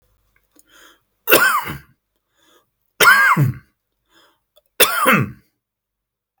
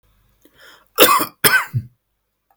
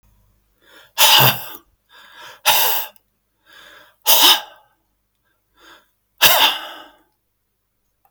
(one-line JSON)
{"three_cough_length": "6.4 s", "three_cough_amplitude": 32768, "three_cough_signal_mean_std_ratio": 0.38, "cough_length": "2.6 s", "cough_amplitude": 32768, "cough_signal_mean_std_ratio": 0.36, "exhalation_length": "8.1 s", "exhalation_amplitude": 32768, "exhalation_signal_mean_std_ratio": 0.35, "survey_phase": "beta (2021-08-13 to 2022-03-07)", "age": "65+", "gender": "Male", "wearing_mask": "No", "symptom_none": true, "smoker_status": "Never smoked", "respiratory_condition_asthma": false, "respiratory_condition_other": false, "recruitment_source": "REACT", "submission_delay": "2 days", "covid_test_result": "Negative", "covid_test_method": "RT-qPCR", "influenza_a_test_result": "Negative", "influenza_b_test_result": "Negative"}